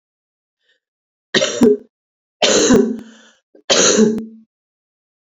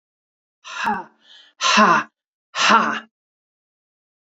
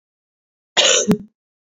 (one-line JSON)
{"three_cough_length": "5.2 s", "three_cough_amplitude": 29009, "three_cough_signal_mean_std_ratio": 0.44, "exhalation_length": "4.4 s", "exhalation_amplitude": 28508, "exhalation_signal_mean_std_ratio": 0.38, "cough_length": "1.6 s", "cough_amplitude": 32418, "cough_signal_mean_std_ratio": 0.4, "survey_phase": "beta (2021-08-13 to 2022-03-07)", "age": "45-64", "gender": "Female", "wearing_mask": "No", "symptom_cough_any": true, "symptom_new_continuous_cough": true, "symptom_runny_or_blocked_nose": true, "symptom_sore_throat": true, "symptom_abdominal_pain": true, "symptom_fatigue": true, "symptom_fever_high_temperature": true, "symptom_headache": true, "symptom_change_to_sense_of_smell_or_taste": true, "smoker_status": "Never smoked", "respiratory_condition_asthma": false, "respiratory_condition_other": false, "recruitment_source": "Test and Trace", "submission_delay": "2 days", "covid_test_result": "Positive", "covid_test_method": "LFT"}